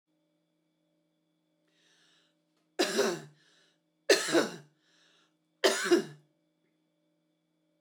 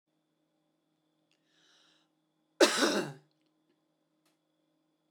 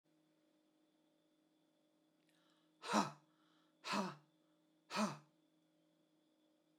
{"three_cough_length": "7.8 s", "three_cough_amplitude": 10998, "three_cough_signal_mean_std_ratio": 0.29, "cough_length": "5.1 s", "cough_amplitude": 11945, "cough_signal_mean_std_ratio": 0.22, "exhalation_length": "6.8 s", "exhalation_amplitude": 2852, "exhalation_signal_mean_std_ratio": 0.27, "survey_phase": "beta (2021-08-13 to 2022-03-07)", "age": "45-64", "gender": "Female", "wearing_mask": "No", "symptom_none": true, "smoker_status": "Never smoked", "respiratory_condition_asthma": false, "respiratory_condition_other": false, "recruitment_source": "Test and Trace", "submission_delay": "2 days", "covid_test_result": "Negative", "covid_test_method": "ePCR"}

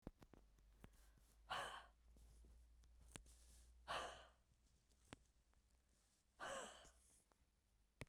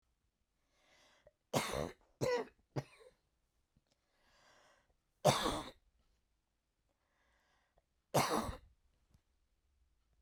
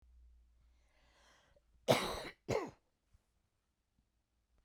{"exhalation_length": "8.1 s", "exhalation_amplitude": 995, "exhalation_signal_mean_std_ratio": 0.46, "three_cough_length": "10.2 s", "three_cough_amplitude": 7086, "three_cough_signal_mean_std_ratio": 0.28, "cough_length": "4.6 s", "cough_amplitude": 5015, "cough_signal_mean_std_ratio": 0.25, "survey_phase": "beta (2021-08-13 to 2022-03-07)", "age": "45-64", "gender": "Female", "wearing_mask": "No", "symptom_none": true, "smoker_status": "Never smoked", "respiratory_condition_asthma": false, "respiratory_condition_other": false, "recruitment_source": "REACT", "submission_delay": "7 days", "covid_test_result": "Negative", "covid_test_method": "RT-qPCR"}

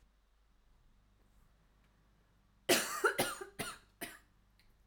{"cough_length": "4.9 s", "cough_amplitude": 5857, "cough_signal_mean_std_ratio": 0.31, "survey_phase": "alpha (2021-03-01 to 2021-08-12)", "age": "18-44", "gender": "Female", "wearing_mask": "No", "symptom_fatigue": true, "smoker_status": "Never smoked", "respiratory_condition_asthma": false, "respiratory_condition_other": false, "recruitment_source": "REACT", "submission_delay": "32 days", "covid_test_result": "Negative", "covid_test_method": "RT-qPCR"}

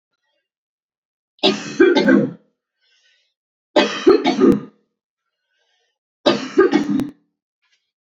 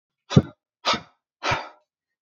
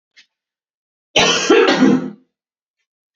{"three_cough_length": "8.2 s", "three_cough_amplitude": 30624, "three_cough_signal_mean_std_ratio": 0.39, "exhalation_length": "2.2 s", "exhalation_amplitude": 25999, "exhalation_signal_mean_std_ratio": 0.28, "cough_length": "3.2 s", "cough_amplitude": 29179, "cough_signal_mean_std_ratio": 0.44, "survey_phase": "alpha (2021-03-01 to 2021-08-12)", "age": "18-44", "gender": "Male", "wearing_mask": "No", "symptom_none": true, "smoker_status": "Never smoked", "respiratory_condition_asthma": true, "respiratory_condition_other": false, "recruitment_source": "Test and Trace", "submission_delay": "1 day", "covid_test_result": "Positive", "covid_test_method": "RT-qPCR", "covid_ct_value": 35.2, "covid_ct_gene": "ORF1ab gene"}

